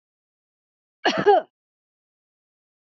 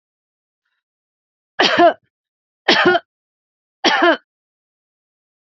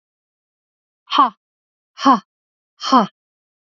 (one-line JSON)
{"cough_length": "2.9 s", "cough_amplitude": 19996, "cough_signal_mean_std_ratio": 0.25, "three_cough_length": "5.5 s", "three_cough_amplitude": 32768, "three_cough_signal_mean_std_ratio": 0.33, "exhalation_length": "3.8 s", "exhalation_amplitude": 31575, "exhalation_signal_mean_std_ratio": 0.28, "survey_phase": "beta (2021-08-13 to 2022-03-07)", "age": "45-64", "gender": "Female", "wearing_mask": "No", "symptom_none": true, "smoker_status": "Ex-smoker", "respiratory_condition_asthma": false, "respiratory_condition_other": false, "recruitment_source": "REACT", "submission_delay": "2 days", "covid_test_result": "Negative", "covid_test_method": "RT-qPCR", "influenza_a_test_result": "Negative", "influenza_b_test_result": "Negative"}